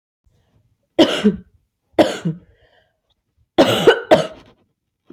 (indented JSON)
{
  "three_cough_length": "5.1 s",
  "three_cough_amplitude": 29092,
  "three_cough_signal_mean_std_ratio": 0.35,
  "survey_phase": "beta (2021-08-13 to 2022-03-07)",
  "age": "18-44",
  "gender": "Female",
  "wearing_mask": "No",
  "symptom_new_continuous_cough": true,
  "symptom_sore_throat": true,
  "symptom_fatigue": true,
  "symptom_fever_high_temperature": true,
  "symptom_headache": true,
  "symptom_onset": "3 days",
  "smoker_status": "Never smoked",
  "respiratory_condition_asthma": false,
  "respiratory_condition_other": false,
  "recruitment_source": "Test and Trace",
  "submission_delay": "1 day",
  "covid_test_result": "Positive",
  "covid_test_method": "RT-qPCR",
  "covid_ct_value": 19.8,
  "covid_ct_gene": "ORF1ab gene",
  "covid_ct_mean": 21.2,
  "covid_viral_load": "120000 copies/ml",
  "covid_viral_load_category": "Low viral load (10K-1M copies/ml)"
}